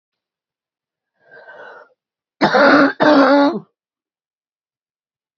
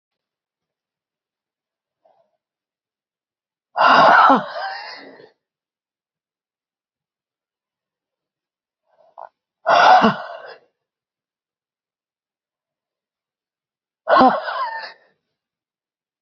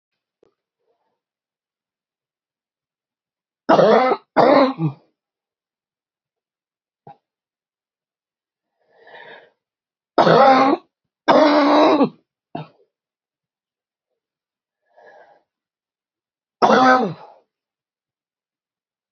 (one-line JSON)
{"cough_length": "5.4 s", "cough_amplitude": 29327, "cough_signal_mean_std_ratio": 0.37, "exhalation_length": "16.2 s", "exhalation_amplitude": 28693, "exhalation_signal_mean_std_ratio": 0.27, "three_cough_length": "19.1 s", "three_cough_amplitude": 32768, "three_cough_signal_mean_std_ratio": 0.31, "survey_phase": "beta (2021-08-13 to 2022-03-07)", "age": "45-64", "gender": "Female", "wearing_mask": "No", "symptom_none": true, "smoker_status": "Ex-smoker", "respiratory_condition_asthma": false, "respiratory_condition_other": false, "recruitment_source": "REACT", "submission_delay": "2 days", "covid_test_result": "Negative", "covid_test_method": "RT-qPCR", "influenza_a_test_result": "Negative", "influenza_b_test_result": "Negative"}